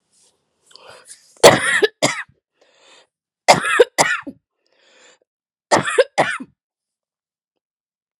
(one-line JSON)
{"three_cough_length": "8.2 s", "three_cough_amplitude": 32768, "three_cough_signal_mean_std_ratio": 0.3, "survey_phase": "beta (2021-08-13 to 2022-03-07)", "age": "45-64", "gender": "Female", "wearing_mask": "No", "symptom_cough_any": true, "symptom_runny_or_blocked_nose": true, "symptom_shortness_of_breath": true, "symptom_fatigue": true, "symptom_fever_high_temperature": true, "symptom_headache": true, "symptom_onset": "3 days", "smoker_status": "Never smoked", "respiratory_condition_asthma": false, "respiratory_condition_other": false, "recruitment_source": "Test and Trace", "submission_delay": "2 days", "covid_test_result": "Positive", "covid_test_method": "RT-qPCR", "covid_ct_value": 23.4, "covid_ct_gene": "N gene"}